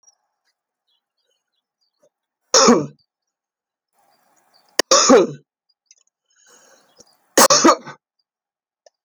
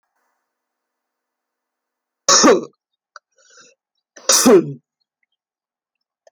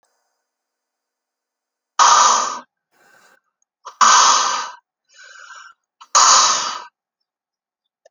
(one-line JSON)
{"three_cough_length": "9.0 s", "three_cough_amplitude": 32767, "three_cough_signal_mean_std_ratio": 0.27, "cough_length": "6.3 s", "cough_amplitude": 32767, "cough_signal_mean_std_ratio": 0.27, "exhalation_length": "8.1 s", "exhalation_amplitude": 32767, "exhalation_signal_mean_std_ratio": 0.38, "survey_phase": "alpha (2021-03-01 to 2021-08-12)", "age": "65+", "gender": "Female", "wearing_mask": "No", "symptom_fatigue": true, "symptom_onset": "12 days", "smoker_status": "Never smoked", "respiratory_condition_asthma": false, "respiratory_condition_other": false, "recruitment_source": "REACT", "submission_delay": "2 days", "covid_test_result": "Negative", "covid_test_method": "RT-qPCR"}